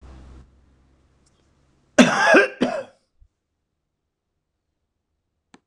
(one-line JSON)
{"cough_length": "5.7 s", "cough_amplitude": 26028, "cough_signal_mean_std_ratio": 0.26, "survey_phase": "beta (2021-08-13 to 2022-03-07)", "age": "65+", "gender": "Male", "wearing_mask": "No", "symptom_none": true, "smoker_status": "Ex-smoker", "respiratory_condition_asthma": false, "respiratory_condition_other": false, "recruitment_source": "REACT", "submission_delay": "8 days", "covid_test_result": "Negative", "covid_test_method": "RT-qPCR", "influenza_a_test_result": "Negative", "influenza_b_test_result": "Negative"}